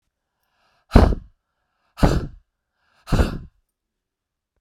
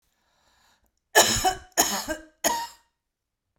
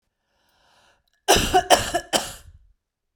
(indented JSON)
{
  "exhalation_length": "4.6 s",
  "exhalation_amplitude": 32768,
  "exhalation_signal_mean_std_ratio": 0.27,
  "three_cough_length": "3.6 s",
  "three_cough_amplitude": 22637,
  "three_cough_signal_mean_std_ratio": 0.37,
  "cough_length": "3.2 s",
  "cough_amplitude": 32768,
  "cough_signal_mean_std_ratio": 0.35,
  "survey_phase": "beta (2021-08-13 to 2022-03-07)",
  "age": "45-64",
  "gender": "Female",
  "wearing_mask": "No",
  "symptom_abdominal_pain": true,
  "smoker_status": "Ex-smoker",
  "respiratory_condition_asthma": false,
  "respiratory_condition_other": false,
  "recruitment_source": "REACT",
  "submission_delay": "13 days",
  "covid_test_result": "Negative",
  "covid_test_method": "RT-qPCR"
}